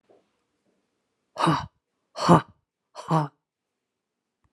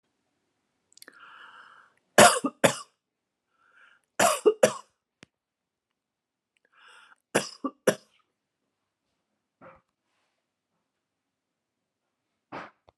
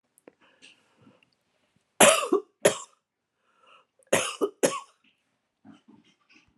exhalation_length: 4.5 s
exhalation_amplitude: 24435
exhalation_signal_mean_std_ratio: 0.27
three_cough_length: 13.0 s
three_cough_amplitude: 28299
three_cough_signal_mean_std_ratio: 0.19
cough_length: 6.6 s
cough_amplitude: 26256
cough_signal_mean_std_ratio: 0.25
survey_phase: alpha (2021-03-01 to 2021-08-12)
age: 65+
gender: Female
wearing_mask: 'No'
symptom_none: true
smoker_status: Never smoked
respiratory_condition_asthma: false
respiratory_condition_other: false
recruitment_source: REACT
submission_delay: 3 days
covid_test_result: Negative
covid_test_method: RT-qPCR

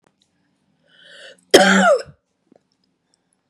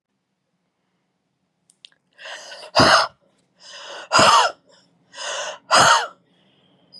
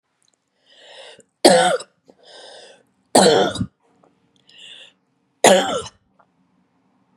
cough_length: 3.5 s
cough_amplitude: 32768
cough_signal_mean_std_ratio: 0.3
exhalation_length: 7.0 s
exhalation_amplitude: 31573
exhalation_signal_mean_std_ratio: 0.35
three_cough_length: 7.2 s
three_cough_amplitude: 32768
three_cough_signal_mean_std_ratio: 0.32
survey_phase: beta (2021-08-13 to 2022-03-07)
age: 45-64
gender: Female
wearing_mask: 'No'
symptom_none: true
smoker_status: Ex-smoker
respiratory_condition_asthma: false
respiratory_condition_other: false
recruitment_source: REACT
submission_delay: 5 days
covid_test_result: Negative
covid_test_method: RT-qPCR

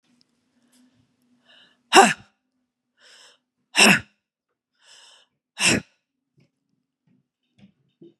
exhalation_length: 8.2 s
exhalation_amplitude: 32767
exhalation_signal_mean_std_ratio: 0.21
survey_phase: beta (2021-08-13 to 2022-03-07)
age: 45-64
gender: Female
wearing_mask: 'No'
symptom_cough_any: true
symptom_new_continuous_cough: true
symptom_runny_or_blocked_nose: true
symptom_fatigue: true
symptom_onset: 3 days
smoker_status: Never smoked
respiratory_condition_asthma: false
respiratory_condition_other: false
recruitment_source: Test and Trace
submission_delay: 1 day
covid_test_result: Negative
covid_test_method: RT-qPCR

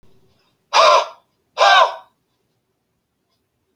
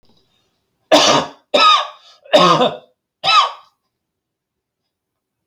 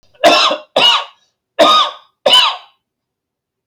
exhalation_length: 3.8 s
exhalation_amplitude: 30357
exhalation_signal_mean_std_ratio: 0.34
three_cough_length: 5.5 s
three_cough_amplitude: 31096
three_cough_signal_mean_std_ratio: 0.41
cough_length: 3.7 s
cough_amplitude: 32768
cough_signal_mean_std_ratio: 0.5
survey_phase: alpha (2021-03-01 to 2021-08-12)
age: 65+
gender: Male
wearing_mask: 'No'
symptom_none: true
smoker_status: Never smoked
respiratory_condition_asthma: false
respiratory_condition_other: false
recruitment_source: REACT
submission_delay: 4 days
covid_test_result: Negative
covid_test_method: RT-qPCR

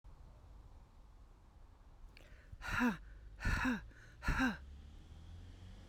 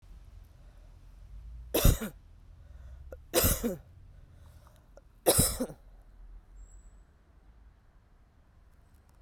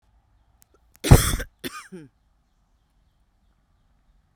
exhalation_length: 5.9 s
exhalation_amplitude: 2461
exhalation_signal_mean_std_ratio: 0.51
three_cough_length: 9.2 s
three_cough_amplitude: 12264
three_cough_signal_mean_std_ratio: 0.33
cough_length: 4.4 s
cough_amplitude: 32768
cough_signal_mean_std_ratio: 0.18
survey_phase: beta (2021-08-13 to 2022-03-07)
age: 45-64
gender: Female
wearing_mask: 'No'
symptom_none: true
smoker_status: Never smoked
respiratory_condition_asthma: false
respiratory_condition_other: false
recruitment_source: REACT
submission_delay: 1 day
covid_test_result: Negative
covid_test_method: RT-qPCR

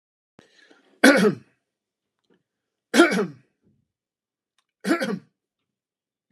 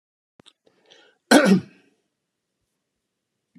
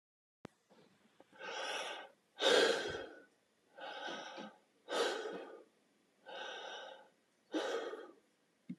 three_cough_length: 6.3 s
three_cough_amplitude: 32084
three_cough_signal_mean_std_ratio: 0.28
cough_length: 3.6 s
cough_amplitude: 29321
cough_signal_mean_std_ratio: 0.23
exhalation_length: 8.8 s
exhalation_amplitude: 4438
exhalation_signal_mean_std_ratio: 0.44
survey_phase: beta (2021-08-13 to 2022-03-07)
age: 45-64
gender: Male
wearing_mask: 'No'
symptom_none: true
smoker_status: Ex-smoker
respiratory_condition_asthma: false
respiratory_condition_other: false
recruitment_source: REACT
submission_delay: 1 day
covid_test_result: Negative
covid_test_method: RT-qPCR
influenza_a_test_result: Negative
influenza_b_test_result: Negative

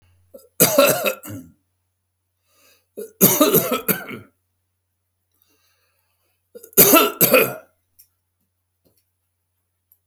three_cough_length: 10.1 s
three_cough_amplitude: 32768
three_cough_signal_mean_std_ratio: 0.33
survey_phase: beta (2021-08-13 to 2022-03-07)
age: 65+
gender: Male
wearing_mask: 'No'
symptom_none: true
smoker_status: Ex-smoker
respiratory_condition_asthma: false
respiratory_condition_other: false
recruitment_source: REACT
submission_delay: 1 day
covid_test_result: Negative
covid_test_method: RT-qPCR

